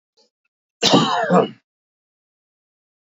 {"cough_length": "3.1 s", "cough_amplitude": 32768, "cough_signal_mean_std_ratio": 0.36, "survey_phase": "beta (2021-08-13 to 2022-03-07)", "age": "45-64", "gender": "Male", "wearing_mask": "No", "symptom_none": true, "smoker_status": "Never smoked", "respiratory_condition_asthma": false, "respiratory_condition_other": false, "recruitment_source": "REACT", "submission_delay": "2 days", "covid_test_result": "Negative", "covid_test_method": "RT-qPCR", "influenza_a_test_result": "Negative", "influenza_b_test_result": "Negative"}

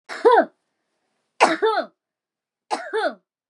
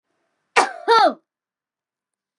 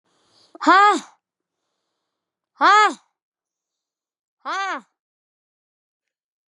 {"three_cough_length": "3.5 s", "three_cough_amplitude": 28815, "three_cough_signal_mean_std_ratio": 0.39, "cough_length": "2.4 s", "cough_amplitude": 32764, "cough_signal_mean_std_ratio": 0.32, "exhalation_length": "6.5 s", "exhalation_amplitude": 27799, "exhalation_signal_mean_std_ratio": 0.27, "survey_phase": "beta (2021-08-13 to 2022-03-07)", "age": "18-44", "gender": "Female", "wearing_mask": "Yes", "symptom_runny_or_blocked_nose": true, "symptom_sore_throat": true, "smoker_status": "Never smoked", "respiratory_condition_asthma": false, "respiratory_condition_other": false, "recruitment_source": "Test and Trace", "submission_delay": "0 days", "covid_test_result": "Positive", "covid_test_method": "ePCR"}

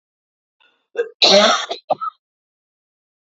{"cough_length": "3.2 s", "cough_amplitude": 32768, "cough_signal_mean_std_ratio": 0.35, "survey_phase": "beta (2021-08-13 to 2022-03-07)", "age": "45-64", "gender": "Female", "wearing_mask": "No", "symptom_cough_any": true, "symptom_runny_or_blocked_nose": true, "symptom_sore_throat": true, "symptom_fatigue": true, "symptom_headache": true, "symptom_change_to_sense_of_smell_or_taste": true, "symptom_loss_of_taste": true, "symptom_onset": "2 days", "smoker_status": "Ex-smoker", "respiratory_condition_asthma": false, "respiratory_condition_other": false, "recruitment_source": "Test and Trace", "submission_delay": "1 day", "covid_test_result": "Positive", "covid_test_method": "RT-qPCR", "covid_ct_value": 18.8, "covid_ct_gene": "ORF1ab gene", "covid_ct_mean": 19.0, "covid_viral_load": "570000 copies/ml", "covid_viral_load_category": "Low viral load (10K-1M copies/ml)"}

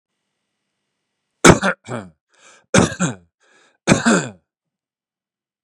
{"three_cough_length": "5.6 s", "three_cough_amplitude": 32768, "three_cough_signal_mean_std_ratio": 0.29, "survey_phase": "beta (2021-08-13 to 2022-03-07)", "age": "45-64", "gender": "Male", "wearing_mask": "No", "symptom_none": true, "smoker_status": "Ex-smoker", "respiratory_condition_asthma": false, "respiratory_condition_other": false, "recruitment_source": "REACT", "submission_delay": "2 days", "covid_test_result": "Negative", "covid_test_method": "RT-qPCR", "influenza_a_test_result": "Negative", "influenza_b_test_result": "Negative"}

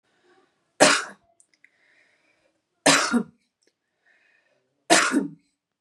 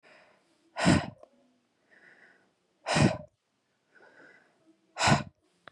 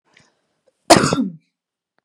{"three_cough_length": "5.8 s", "three_cough_amplitude": 29083, "three_cough_signal_mean_std_ratio": 0.3, "exhalation_length": "5.7 s", "exhalation_amplitude": 10889, "exhalation_signal_mean_std_ratio": 0.3, "cough_length": "2.0 s", "cough_amplitude": 32768, "cough_signal_mean_std_ratio": 0.29, "survey_phase": "beta (2021-08-13 to 2022-03-07)", "age": "18-44", "gender": "Female", "wearing_mask": "No", "symptom_cough_any": true, "symptom_sore_throat": true, "smoker_status": "Never smoked", "respiratory_condition_asthma": false, "respiratory_condition_other": false, "recruitment_source": "REACT", "submission_delay": "1 day", "covid_test_result": "Negative", "covid_test_method": "RT-qPCR", "influenza_a_test_result": "Negative", "influenza_b_test_result": "Negative"}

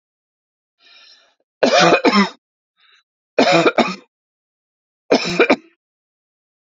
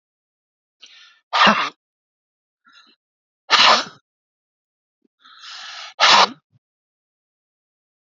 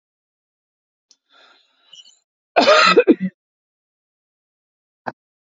{"three_cough_length": "6.7 s", "three_cough_amplitude": 32506, "three_cough_signal_mean_std_ratio": 0.37, "exhalation_length": "8.0 s", "exhalation_amplitude": 32767, "exhalation_signal_mean_std_ratio": 0.28, "cough_length": "5.5 s", "cough_amplitude": 27830, "cough_signal_mean_std_ratio": 0.26, "survey_phase": "beta (2021-08-13 to 2022-03-07)", "age": "45-64", "gender": "Female", "wearing_mask": "No", "symptom_none": true, "smoker_status": "Ex-smoker", "respiratory_condition_asthma": false, "respiratory_condition_other": false, "recruitment_source": "REACT", "submission_delay": "3 days", "covid_test_result": "Negative", "covid_test_method": "RT-qPCR", "influenza_a_test_result": "Negative", "influenza_b_test_result": "Negative"}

